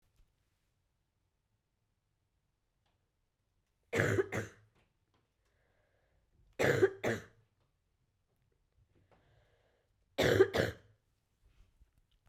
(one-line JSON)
{"three_cough_length": "12.3 s", "three_cough_amplitude": 7179, "three_cough_signal_mean_std_ratio": 0.26, "survey_phase": "beta (2021-08-13 to 2022-03-07)", "age": "18-44", "gender": "Female", "wearing_mask": "Yes", "symptom_fatigue": true, "symptom_fever_high_temperature": true, "symptom_onset": "3 days", "smoker_status": "Never smoked", "respiratory_condition_asthma": false, "respiratory_condition_other": false, "recruitment_source": "Test and Trace", "submission_delay": "2 days", "covid_test_result": "Positive", "covid_test_method": "RT-qPCR", "covid_ct_value": 18.8, "covid_ct_gene": "ORF1ab gene", "covid_ct_mean": 19.0, "covid_viral_load": "580000 copies/ml", "covid_viral_load_category": "Low viral load (10K-1M copies/ml)"}